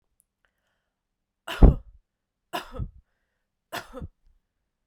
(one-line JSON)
{"three_cough_length": "4.9 s", "three_cough_amplitude": 29466, "three_cough_signal_mean_std_ratio": 0.18, "survey_phase": "beta (2021-08-13 to 2022-03-07)", "age": "18-44", "gender": "Female", "wearing_mask": "No", "symptom_runny_or_blocked_nose": true, "smoker_status": "Never smoked", "respiratory_condition_asthma": false, "respiratory_condition_other": false, "recruitment_source": "Test and Trace", "submission_delay": "2 days", "covid_test_result": "Positive", "covid_test_method": "RT-qPCR", "covid_ct_value": 18.8, "covid_ct_gene": "ORF1ab gene", "covid_ct_mean": 20.3, "covid_viral_load": "220000 copies/ml", "covid_viral_load_category": "Low viral load (10K-1M copies/ml)"}